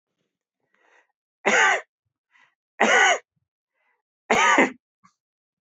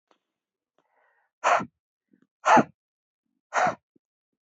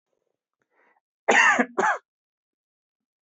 {"three_cough_length": "5.6 s", "three_cough_amplitude": 22277, "three_cough_signal_mean_std_ratio": 0.36, "exhalation_length": "4.5 s", "exhalation_amplitude": 17681, "exhalation_signal_mean_std_ratio": 0.26, "cough_length": "3.2 s", "cough_amplitude": 20436, "cough_signal_mean_std_ratio": 0.32, "survey_phase": "beta (2021-08-13 to 2022-03-07)", "age": "18-44", "gender": "Male", "wearing_mask": "No", "symptom_none": true, "smoker_status": "Never smoked", "respiratory_condition_asthma": false, "respiratory_condition_other": false, "recruitment_source": "Test and Trace", "submission_delay": "2 days", "covid_test_result": "Negative", "covid_test_method": "RT-qPCR"}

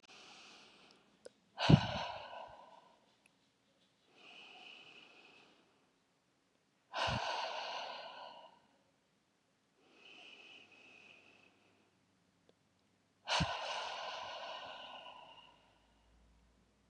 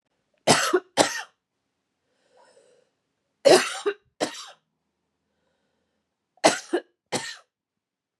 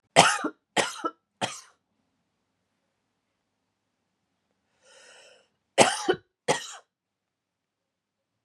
{"exhalation_length": "16.9 s", "exhalation_amplitude": 9311, "exhalation_signal_mean_std_ratio": 0.3, "three_cough_length": "8.2 s", "three_cough_amplitude": 25810, "three_cough_signal_mean_std_ratio": 0.27, "cough_length": "8.4 s", "cough_amplitude": 29850, "cough_signal_mean_std_ratio": 0.24, "survey_phase": "beta (2021-08-13 to 2022-03-07)", "age": "45-64", "gender": "Female", "wearing_mask": "Yes", "symptom_none": true, "smoker_status": "Never smoked", "respiratory_condition_asthma": false, "respiratory_condition_other": false, "recruitment_source": "REACT", "submission_delay": "1 day", "covid_test_result": "Negative", "covid_test_method": "RT-qPCR", "influenza_a_test_result": "Unknown/Void", "influenza_b_test_result": "Unknown/Void"}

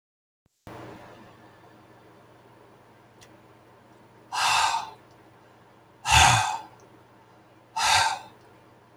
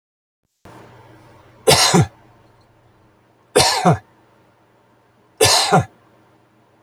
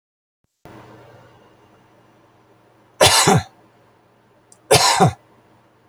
{"exhalation_length": "9.0 s", "exhalation_amplitude": 19391, "exhalation_signal_mean_std_ratio": 0.35, "three_cough_length": "6.8 s", "three_cough_amplitude": 32767, "three_cough_signal_mean_std_ratio": 0.35, "cough_length": "5.9 s", "cough_amplitude": 32756, "cough_signal_mean_std_ratio": 0.31, "survey_phase": "alpha (2021-03-01 to 2021-08-12)", "age": "65+", "gender": "Male", "wearing_mask": "No", "symptom_none": true, "smoker_status": "Never smoked", "respiratory_condition_asthma": false, "respiratory_condition_other": false, "recruitment_source": "REACT", "submission_delay": "2 days", "covid_test_result": "Negative", "covid_test_method": "RT-qPCR"}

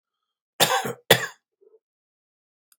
{"cough_length": "2.8 s", "cough_amplitude": 32768, "cough_signal_mean_std_ratio": 0.26, "survey_phase": "beta (2021-08-13 to 2022-03-07)", "age": "65+", "gender": "Male", "wearing_mask": "No", "symptom_cough_any": true, "symptom_abdominal_pain": true, "smoker_status": "Ex-smoker", "respiratory_condition_asthma": false, "respiratory_condition_other": false, "recruitment_source": "REACT", "submission_delay": "5 days", "covid_test_result": "Negative", "covid_test_method": "RT-qPCR", "influenza_a_test_result": "Negative", "influenza_b_test_result": "Negative"}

